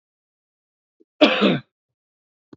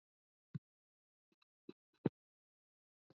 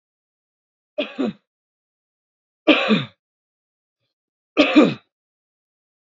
cough_length: 2.6 s
cough_amplitude: 29174
cough_signal_mean_std_ratio: 0.28
exhalation_length: 3.2 s
exhalation_amplitude: 3186
exhalation_signal_mean_std_ratio: 0.09
three_cough_length: 6.1 s
three_cough_amplitude: 28129
three_cough_signal_mean_std_ratio: 0.28
survey_phase: alpha (2021-03-01 to 2021-08-12)
age: 45-64
gender: Female
wearing_mask: 'No'
symptom_cough_any: true
symptom_shortness_of_breath: true
symptom_fatigue: true
symptom_onset: 6 days
smoker_status: Ex-smoker
respiratory_condition_asthma: false
respiratory_condition_other: false
recruitment_source: Test and Trace
submission_delay: 5 days
covid_test_result: Positive
covid_test_method: RT-qPCR
covid_ct_value: 15.7
covid_ct_gene: N gene
covid_ct_mean: 15.9
covid_viral_load: 6000000 copies/ml
covid_viral_load_category: High viral load (>1M copies/ml)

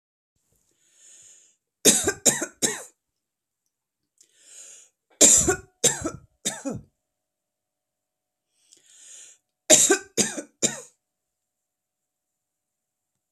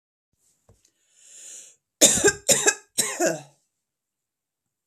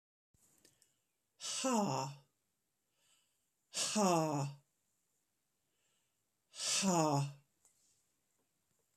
three_cough_length: 13.3 s
three_cough_amplitude: 32768
three_cough_signal_mean_std_ratio: 0.27
cough_length: 4.9 s
cough_amplitude: 32768
cough_signal_mean_std_ratio: 0.32
exhalation_length: 9.0 s
exhalation_amplitude: 4040
exhalation_signal_mean_std_ratio: 0.39
survey_phase: alpha (2021-03-01 to 2021-08-12)
age: 45-64
gender: Female
wearing_mask: 'No'
symptom_none: true
smoker_status: Never smoked
respiratory_condition_asthma: false
respiratory_condition_other: false
recruitment_source: REACT
submission_delay: 3 days
covid_test_result: Negative
covid_test_method: RT-qPCR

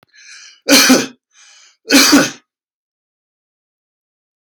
cough_length: 4.6 s
cough_amplitude: 32768
cough_signal_mean_std_ratio: 0.35
survey_phase: alpha (2021-03-01 to 2021-08-12)
age: 45-64
gender: Male
wearing_mask: 'No'
symptom_none: true
smoker_status: Ex-smoker
respiratory_condition_asthma: true
respiratory_condition_other: false
recruitment_source: REACT
submission_delay: 1 day
covid_test_result: Negative
covid_test_method: RT-qPCR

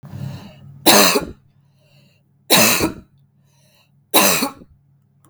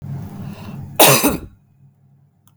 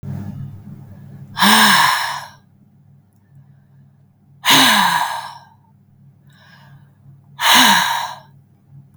three_cough_length: 5.3 s
three_cough_amplitude: 32768
three_cough_signal_mean_std_ratio: 0.4
cough_length: 2.6 s
cough_amplitude: 32768
cough_signal_mean_std_ratio: 0.4
exhalation_length: 9.0 s
exhalation_amplitude: 32768
exhalation_signal_mean_std_ratio: 0.45
survey_phase: beta (2021-08-13 to 2022-03-07)
age: 18-44
gender: Female
wearing_mask: 'No'
symptom_none: true
symptom_onset: 8 days
smoker_status: Ex-smoker
respiratory_condition_asthma: false
respiratory_condition_other: false
recruitment_source: REACT
submission_delay: 3 days
covid_test_result: Negative
covid_test_method: RT-qPCR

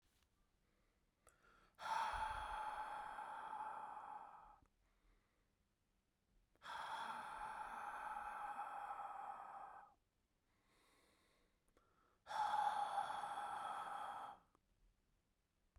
exhalation_length: 15.8 s
exhalation_amplitude: 1065
exhalation_signal_mean_std_ratio: 0.6
survey_phase: beta (2021-08-13 to 2022-03-07)
age: 18-44
gender: Male
wearing_mask: 'No'
symptom_runny_or_blocked_nose: true
symptom_fatigue: true
symptom_onset: 3 days
smoker_status: Ex-smoker
respiratory_condition_asthma: false
respiratory_condition_other: false
recruitment_source: Test and Trace
submission_delay: 2 days
covid_test_result: Positive
covid_test_method: ePCR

